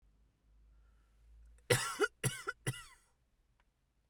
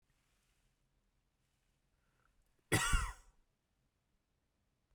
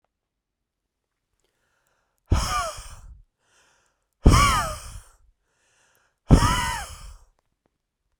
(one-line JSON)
{"three_cough_length": "4.1 s", "three_cough_amplitude": 6003, "three_cough_signal_mean_std_ratio": 0.31, "cough_length": "4.9 s", "cough_amplitude": 3977, "cough_signal_mean_std_ratio": 0.22, "exhalation_length": "8.2 s", "exhalation_amplitude": 32768, "exhalation_signal_mean_std_ratio": 0.3, "survey_phase": "beta (2021-08-13 to 2022-03-07)", "age": "18-44", "gender": "Male", "wearing_mask": "No", "symptom_sore_throat": true, "smoker_status": "Never smoked", "respiratory_condition_asthma": false, "respiratory_condition_other": false, "recruitment_source": "REACT", "submission_delay": "1 day", "covid_test_result": "Negative", "covid_test_method": "RT-qPCR"}